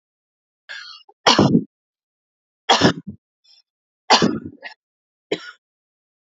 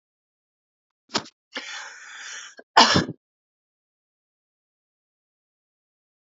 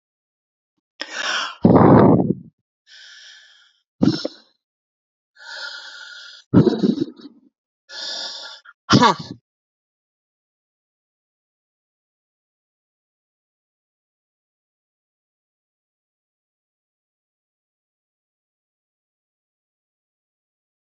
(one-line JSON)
{"three_cough_length": "6.4 s", "three_cough_amplitude": 32767, "three_cough_signal_mean_std_ratio": 0.3, "cough_length": "6.2 s", "cough_amplitude": 32409, "cough_signal_mean_std_ratio": 0.21, "exhalation_length": "20.9 s", "exhalation_amplitude": 32079, "exhalation_signal_mean_std_ratio": 0.24, "survey_phase": "alpha (2021-03-01 to 2021-08-12)", "age": "45-64", "gender": "Female", "wearing_mask": "No", "symptom_cough_any": true, "symptom_fatigue": true, "symptom_headache": true, "symptom_onset": "12 days", "smoker_status": "Current smoker (e-cigarettes or vapes only)", "respiratory_condition_asthma": false, "respiratory_condition_other": false, "recruitment_source": "REACT", "submission_delay": "2 days", "covid_test_result": "Negative", "covid_test_method": "RT-qPCR"}